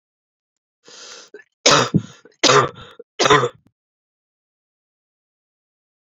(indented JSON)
{
  "three_cough_length": "6.1 s",
  "three_cough_amplitude": 32768,
  "three_cough_signal_mean_std_ratio": 0.29,
  "survey_phase": "beta (2021-08-13 to 2022-03-07)",
  "age": "18-44",
  "gender": "Female",
  "wearing_mask": "No",
  "symptom_cough_any": true,
  "symptom_runny_or_blocked_nose": true,
  "symptom_fatigue": true,
  "symptom_fever_high_temperature": true,
  "symptom_headache": true,
  "smoker_status": "Ex-smoker",
  "respiratory_condition_asthma": false,
  "respiratory_condition_other": false,
  "recruitment_source": "Test and Trace",
  "submission_delay": "2 days",
  "covid_test_result": "Positive",
  "covid_test_method": "RT-qPCR",
  "covid_ct_value": 24.0,
  "covid_ct_gene": "ORF1ab gene",
  "covid_ct_mean": 24.7,
  "covid_viral_load": "8100 copies/ml",
  "covid_viral_load_category": "Minimal viral load (< 10K copies/ml)"
}